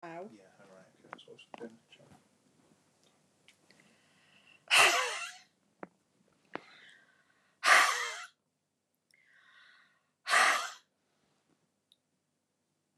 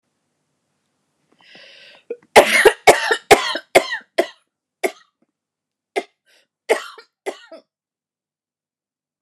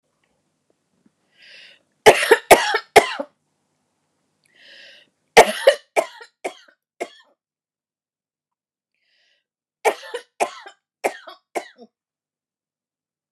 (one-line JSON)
{"exhalation_length": "13.0 s", "exhalation_amplitude": 12026, "exhalation_signal_mean_std_ratio": 0.27, "cough_length": "9.2 s", "cough_amplitude": 29204, "cough_signal_mean_std_ratio": 0.26, "three_cough_length": "13.3 s", "three_cough_amplitude": 29204, "three_cough_signal_mean_std_ratio": 0.22, "survey_phase": "beta (2021-08-13 to 2022-03-07)", "age": "45-64", "gender": "Female", "wearing_mask": "No", "symptom_cough_any": true, "symptom_shortness_of_breath": true, "symptom_sore_throat": true, "symptom_onset": "11 days", "smoker_status": "Ex-smoker", "respiratory_condition_asthma": true, "respiratory_condition_other": false, "recruitment_source": "REACT", "submission_delay": "1 day", "covid_test_result": "Negative", "covid_test_method": "RT-qPCR"}